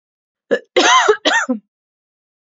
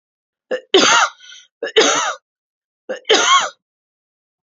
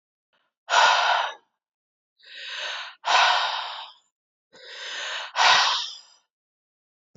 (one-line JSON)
{"cough_length": "2.5 s", "cough_amplitude": 30241, "cough_signal_mean_std_ratio": 0.45, "three_cough_length": "4.4 s", "three_cough_amplitude": 31922, "three_cough_signal_mean_std_ratio": 0.44, "exhalation_length": "7.2 s", "exhalation_amplitude": 18653, "exhalation_signal_mean_std_ratio": 0.46, "survey_phase": "beta (2021-08-13 to 2022-03-07)", "age": "18-44", "gender": "Female", "wearing_mask": "No", "symptom_cough_any": true, "symptom_runny_or_blocked_nose": true, "symptom_sore_throat": true, "symptom_fatigue": true, "symptom_headache": true, "smoker_status": "Ex-smoker", "respiratory_condition_asthma": true, "respiratory_condition_other": false, "recruitment_source": "Test and Trace", "submission_delay": "1 day", "covid_test_result": "Negative", "covid_test_method": "RT-qPCR"}